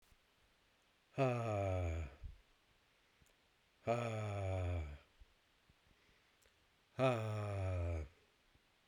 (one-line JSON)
{"exhalation_length": "8.9 s", "exhalation_amplitude": 2451, "exhalation_signal_mean_std_ratio": 0.56, "survey_phase": "beta (2021-08-13 to 2022-03-07)", "age": "45-64", "gender": "Male", "wearing_mask": "No", "symptom_diarrhoea": true, "symptom_fatigue": true, "symptom_fever_high_temperature": true, "symptom_headache": true, "symptom_change_to_sense_of_smell_or_taste": true, "smoker_status": "Never smoked", "respiratory_condition_asthma": false, "respiratory_condition_other": false, "recruitment_source": "Test and Trace", "submission_delay": "2 days", "covid_test_result": "Positive", "covid_test_method": "RT-qPCR", "covid_ct_value": 36.0, "covid_ct_gene": "ORF1ab gene", "covid_ct_mean": 36.4, "covid_viral_load": "1.1 copies/ml", "covid_viral_load_category": "Minimal viral load (< 10K copies/ml)"}